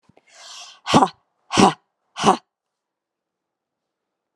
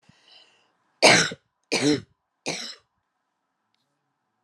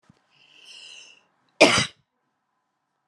{"exhalation_length": "4.4 s", "exhalation_amplitude": 32767, "exhalation_signal_mean_std_ratio": 0.26, "three_cough_length": "4.4 s", "three_cough_amplitude": 27669, "three_cough_signal_mean_std_ratio": 0.28, "cough_length": "3.1 s", "cough_amplitude": 29354, "cough_signal_mean_std_ratio": 0.22, "survey_phase": "alpha (2021-03-01 to 2021-08-12)", "age": "45-64", "gender": "Female", "wearing_mask": "No", "symptom_headache": true, "smoker_status": "Never smoked", "respiratory_condition_asthma": false, "respiratory_condition_other": false, "recruitment_source": "Test and Trace", "submission_delay": "2 days", "covid_test_result": "Positive", "covid_test_method": "RT-qPCR"}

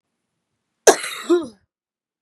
{"cough_length": "2.2 s", "cough_amplitude": 32768, "cough_signal_mean_std_ratio": 0.27, "survey_phase": "beta (2021-08-13 to 2022-03-07)", "age": "18-44", "gender": "Female", "wearing_mask": "No", "symptom_cough_any": true, "symptom_runny_or_blocked_nose": true, "symptom_shortness_of_breath": true, "symptom_sore_throat": true, "symptom_change_to_sense_of_smell_or_taste": true, "smoker_status": "Never smoked", "respiratory_condition_asthma": false, "respiratory_condition_other": false, "recruitment_source": "Test and Trace", "submission_delay": "1 day", "covid_test_result": "Positive", "covid_test_method": "LFT"}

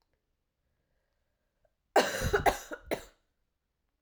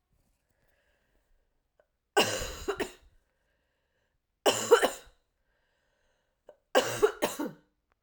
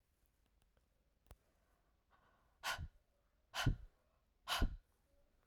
{"cough_length": "4.0 s", "cough_amplitude": 10121, "cough_signal_mean_std_ratio": 0.29, "three_cough_length": "8.0 s", "three_cough_amplitude": 15687, "three_cough_signal_mean_std_ratio": 0.29, "exhalation_length": "5.5 s", "exhalation_amplitude": 1873, "exhalation_signal_mean_std_ratio": 0.28, "survey_phase": "beta (2021-08-13 to 2022-03-07)", "age": "18-44", "gender": "Female", "wearing_mask": "No", "symptom_cough_any": true, "symptom_new_continuous_cough": true, "symptom_runny_or_blocked_nose": true, "symptom_fatigue": true, "symptom_fever_high_temperature": true, "symptom_headache": true, "symptom_change_to_sense_of_smell_or_taste": true, "symptom_onset": "2 days", "smoker_status": "Never smoked", "respiratory_condition_asthma": false, "respiratory_condition_other": false, "recruitment_source": "Test and Trace", "submission_delay": "2 days", "covid_test_result": "Positive", "covid_test_method": "RT-qPCR", "covid_ct_value": 14.9, "covid_ct_gene": "ORF1ab gene", "covid_ct_mean": 15.1, "covid_viral_load": "12000000 copies/ml", "covid_viral_load_category": "High viral load (>1M copies/ml)"}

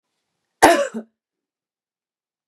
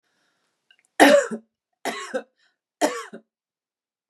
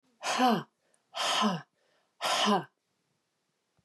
{"cough_length": "2.5 s", "cough_amplitude": 32768, "cough_signal_mean_std_ratio": 0.24, "three_cough_length": "4.1 s", "three_cough_amplitude": 32767, "three_cough_signal_mean_std_ratio": 0.28, "exhalation_length": "3.8 s", "exhalation_amplitude": 7737, "exhalation_signal_mean_std_ratio": 0.47, "survey_phase": "beta (2021-08-13 to 2022-03-07)", "age": "45-64", "gender": "Female", "wearing_mask": "No", "symptom_none": true, "smoker_status": "Never smoked", "respiratory_condition_asthma": false, "respiratory_condition_other": false, "recruitment_source": "REACT", "submission_delay": "5 days", "covid_test_result": "Negative", "covid_test_method": "RT-qPCR", "influenza_a_test_result": "Negative", "influenza_b_test_result": "Negative"}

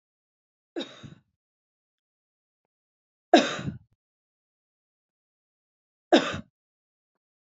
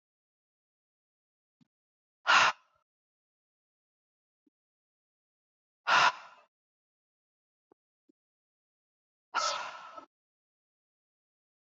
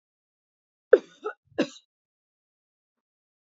{"three_cough_length": "7.6 s", "three_cough_amplitude": 20435, "three_cough_signal_mean_std_ratio": 0.18, "exhalation_length": "11.6 s", "exhalation_amplitude": 9354, "exhalation_signal_mean_std_ratio": 0.2, "cough_length": "3.5 s", "cough_amplitude": 25830, "cough_signal_mean_std_ratio": 0.13, "survey_phase": "beta (2021-08-13 to 2022-03-07)", "age": "45-64", "gender": "Female", "wearing_mask": "No", "symptom_fatigue": true, "symptom_onset": "12 days", "smoker_status": "Ex-smoker", "respiratory_condition_asthma": false, "respiratory_condition_other": false, "recruitment_source": "REACT", "submission_delay": "2 days", "covid_test_result": "Negative", "covid_test_method": "RT-qPCR", "influenza_a_test_result": "Negative", "influenza_b_test_result": "Negative"}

